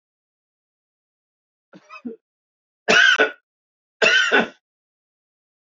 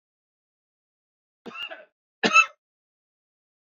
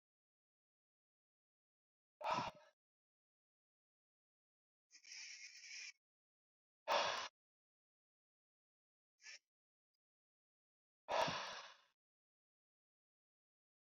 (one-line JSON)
{"three_cough_length": "5.6 s", "three_cough_amplitude": 24739, "three_cough_signal_mean_std_ratio": 0.32, "cough_length": "3.8 s", "cough_amplitude": 19648, "cough_signal_mean_std_ratio": 0.19, "exhalation_length": "13.9 s", "exhalation_amplitude": 1845, "exhalation_signal_mean_std_ratio": 0.25, "survey_phase": "beta (2021-08-13 to 2022-03-07)", "age": "45-64", "gender": "Male", "wearing_mask": "No", "symptom_runny_or_blocked_nose": true, "smoker_status": "Ex-smoker", "respiratory_condition_asthma": false, "respiratory_condition_other": false, "recruitment_source": "REACT", "submission_delay": "1 day", "covid_test_result": "Negative", "covid_test_method": "RT-qPCR", "influenza_a_test_result": "Negative", "influenza_b_test_result": "Negative"}